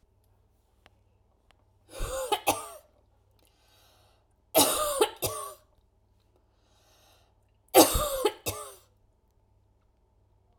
{"three_cough_length": "10.6 s", "three_cough_amplitude": 24192, "three_cough_signal_mean_std_ratio": 0.29, "survey_phase": "beta (2021-08-13 to 2022-03-07)", "age": "45-64", "gender": "Female", "wearing_mask": "No", "symptom_sore_throat": true, "symptom_headache": true, "symptom_onset": "12 days", "smoker_status": "Ex-smoker", "respiratory_condition_asthma": false, "respiratory_condition_other": false, "recruitment_source": "REACT", "submission_delay": "1 day", "covid_test_result": "Negative", "covid_test_method": "RT-qPCR"}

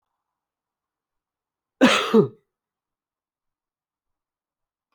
{"cough_length": "4.9 s", "cough_amplitude": 24239, "cough_signal_mean_std_ratio": 0.21, "survey_phase": "beta (2021-08-13 to 2022-03-07)", "age": "18-44", "gender": "Male", "wearing_mask": "No", "symptom_cough_any": true, "symptom_runny_or_blocked_nose": true, "symptom_fatigue": true, "symptom_change_to_sense_of_smell_or_taste": true, "symptom_loss_of_taste": true, "symptom_other": true, "smoker_status": "Never smoked", "respiratory_condition_asthma": false, "respiratory_condition_other": false, "recruitment_source": "Test and Trace", "submission_delay": "2 days", "covid_test_result": "Positive", "covid_test_method": "RT-qPCR", "covid_ct_value": 28.4, "covid_ct_gene": "ORF1ab gene"}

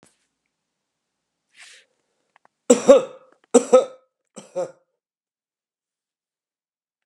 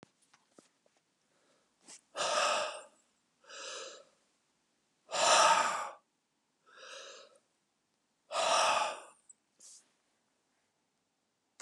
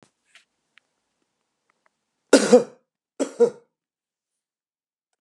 {"three_cough_length": "7.1 s", "three_cough_amplitude": 32767, "three_cough_signal_mean_std_ratio": 0.2, "exhalation_length": "11.6 s", "exhalation_amplitude": 6905, "exhalation_signal_mean_std_ratio": 0.35, "cough_length": "5.2 s", "cough_amplitude": 30555, "cough_signal_mean_std_ratio": 0.2, "survey_phase": "beta (2021-08-13 to 2022-03-07)", "age": "65+", "gender": "Male", "wearing_mask": "No", "symptom_none": true, "smoker_status": "Ex-smoker", "respiratory_condition_asthma": false, "respiratory_condition_other": false, "recruitment_source": "REACT", "submission_delay": "1 day", "covid_test_result": "Negative", "covid_test_method": "RT-qPCR"}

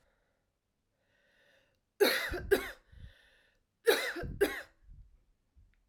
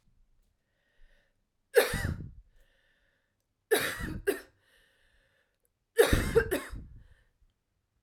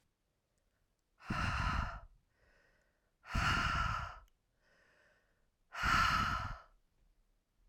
{"cough_length": "5.9 s", "cough_amplitude": 7733, "cough_signal_mean_std_ratio": 0.33, "three_cough_length": "8.0 s", "three_cough_amplitude": 12565, "three_cough_signal_mean_std_ratio": 0.32, "exhalation_length": "7.7 s", "exhalation_amplitude": 3311, "exhalation_signal_mean_std_ratio": 0.46, "survey_phase": "alpha (2021-03-01 to 2021-08-12)", "age": "18-44", "gender": "Female", "wearing_mask": "No", "symptom_cough_any": true, "symptom_shortness_of_breath": true, "symptom_fatigue": true, "symptom_fever_high_temperature": true, "symptom_headache": true, "symptom_change_to_sense_of_smell_or_taste": true, "symptom_onset": "9 days", "smoker_status": "Ex-smoker", "respiratory_condition_asthma": false, "respiratory_condition_other": false, "recruitment_source": "Test and Trace", "submission_delay": "1 day", "covid_test_result": "Positive", "covid_test_method": "RT-qPCR", "covid_ct_value": 12.6, "covid_ct_gene": "ORF1ab gene", "covid_ct_mean": 13.7, "covid_viral_load": "32000000 copies/ml", "covid_viral_load_category": "High viral load (>1M copies/ml)"}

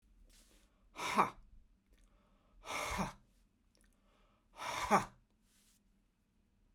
{"exhalation_length": "6.7 s", "exhalation_amplitude": 5263, "exhalation_signal_mean_std_ratio": 0.31, "survey_phase": "beta (2021-08-13 to 2022-03-07)", "age": "45-64", "gender": "Male", "wearing_mask": "No", "symptom_cough_any": true, "symptom_runny_or_blocked_nose": true, "symptom_sore_throat": true, "symptom_fatigue": true, "symptom_headache": true, "symptom_other": true, "symptom_onset": "4 days", "smoker_status": "Ex-smoker", "respiratory_condition_asthma": false, "respiratory_condition_other": false, "recruitment_source": "Test and Trace", "submission_delay": "1 day", "covid_test_result": "Positive", "covid_test_method": "ePCR"}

